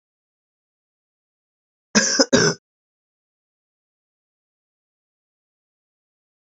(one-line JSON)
{"cough_length": "6.5 s", "cough_amplitude": 29334, "cough_signal_mean_std_ratio": 0.2, "survey_phase": "beta (2021-08-13 to 2022-03-07)", "age": "45-64", "gender": "Female", "wearing_mask": "No", "symptom_cough_any": true, "symptom_new_continuous_cough": true, "symptom_runny_or_blocked_nose": true, "symptom_shortness_of_breath": true, "symptom_sore_throat": true, "symptom_abdominal_pain": true, "symptom_fatigue": true, "symptom_fever_high_temperature": true, "symptom_headache": true, "symptom_change_to_sense_of_smell_or_taste": true, "symptom_loss_of_taste": true, "symptom_onset": "2 days", "smoker_status": "Never smoked", "respiratory_condition_asthma": false, "respiratory_condition_other": false, "recruitment_source": "Test and Trace", "submission_delay": "2 days", "covid_test_result": "Positive", "covid_test_method": "ePCR"}